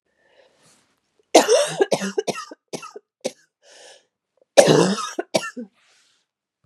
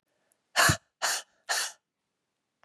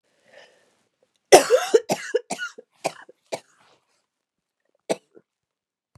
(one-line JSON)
{"three_cough_length": "6.7 s", "three_cough_amplitude": 32768, "three_cough_signal_mean_std_ratio": 0.33, "exhalation_length": "2.6 s", "exhalation_amplitude": 11693, "exhalation_signal_mean_std_ratio": 0.35, "cough_length": "6.0 s", "cough_amplitude": 32768, "cough_signal_mean_std_ratio": 0.23, "survey_phase": "beta (2021-08-13 to 2022-03-07)", "age": "45-64", "gender": "Female", "wearing_mask": "No", "symptom_cough_any": true, "symptom_new_continuous_cough": true, "symptom_runny_or_blocked_nose": true, "symptom_fatigue": true, "symptom_headache": true, "symptom_change_to_sense_of_smell_or_taste": true, "symptom_loss_of_taste": true, "symptom_onset": "3 days", "smoker_status": "Ex-smoker", "respiratory_condition_asthma": false, "respiratory_condition_other": false, "recruitment_source": "Test and Trace", "submission_delay": "2 days", "covid_test_result": "Positive", "covid_test_method": "ePCR"}